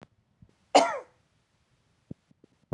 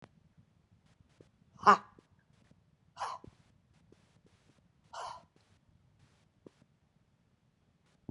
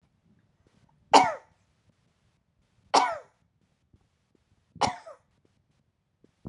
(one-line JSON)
{"cough_length": "2.7 s", "cough_amplitude": 17472, "cough_signal_mean_std_ratio": 0.21, "exhalation_length": "8.1 s", "exhalation_amplitude": 12471, "exhalation_signal_mean_std_ratio": 0.15, "three_cough_length": "6.5 s", "three_cough_amplitude": 24525, "three_cough_signal_mean_std_ratio": 0.2, "survey_phase": "alpha (2021-03-01 to 2021-08-12)", "age": "65+", "gender": "Female", "wearing_mask": "No", "symptom_none": true, "smoker_status": "Ex-smoker", "respiratory_condition_asthma": false, "respiratory_condition_other": true, "recruitment_source": "REACT", "submission_delay": "1 day", "covid_test_result": "Negative", "covid_test_method": "RT-qPCR"}